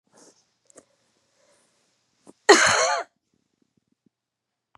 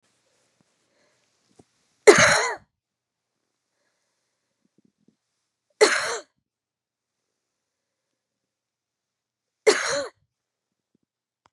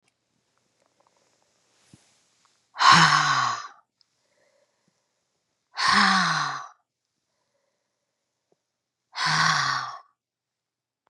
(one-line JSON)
{"cough_length": "4.8 s", "cough_amplitude": 30275, "cough_signal_mean_std_ratio": 0.24, "three_cough_length": "11.5 s", "three_cough_amplitude": 32745, "three_cough_signal_mean_std_ratio": 0.21, "exhalation_length": "11.1 s", "exhalation_amplitude": 26367, "exhalation_signal_mean_std_ratio": 0.35, "survey_phase": "beta (2021-08-13 to 2022-03-07)", "age": "45-64", "gender": "Female", "wearing_mask": "No", "symptom_cough_any": true, "symptom_runny_or_blocked_nose": true, "symptom_change_to_sense_of_smell_or_taste": true, "symptom_onset": "3 days", "smoker_status": "Never smoked", "respiratory_condition_asthma": false, "respiratory_condition_other": false, "recruitment_source": "Test and Trace", "submission_delay": "2 days", "covid_test_result": "Positive", "covid_test_method": "RT-qPCR", "covid_ct_value": 18.0, "covid_ct_gene": "ORF1ab gene", "covid_ct_mean": 18.4, "covid_viral_load": "900000 copies/ml", "covid_viral_load_category": "Low viral load (10K-1M copies/ml)"}